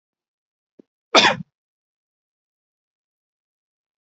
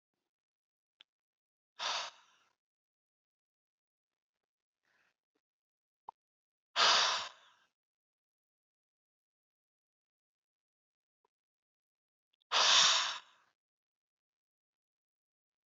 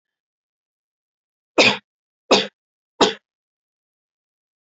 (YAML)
cough_length: 4.0 s
cough_amplitude: 32336
cough_signal_mean_std_ratio: 0.17
exhalation_length: 15.7 s
exhalation_amplitude: 6767
exhalation_signal_mean_std_ratio: 0.22
three_cough_length: 4.6 s
three_cough_amplitude: 29812
three_cough_signal_mean_std_ratio: 0.23
survey_phase: beta (2021-08-13 to 2022-03-07)
age: 18-44
gender: Male
wearing_mask: 'No'
symptom_none: true
smoker_status: Never smoked
respiratory_condition_asthma: true
respiratory_condition_other: false
recruitment_source: REACT
submission_delay: 1 day
covid_test_result: Negative
covid_test_method: RT-qPCR